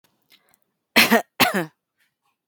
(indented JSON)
{
  "cough_length": "2.5 s",
  "cough_amplitude": 32768,
  "cough_signal_mean_std_ratio": 0.31,
  "survey_phase": "beta (2021-08-13 to 2022-03-07)",
  "age": "18-44",
  "gender": "Female",
  "wearing_mask": "No",
  "symptom_none": true,
  "smoker_status": "Current smoker (1 to 10 cigarettes per day)",
  "respiratory_condition_asthma": false,
  "respiratory_condition_other": false,
  "recruitment_source": "REACT",
  "submission_delay": "3 days",
  "covid_test_result": "Negative",
  "covid_test_method": "RT-qPCR"
}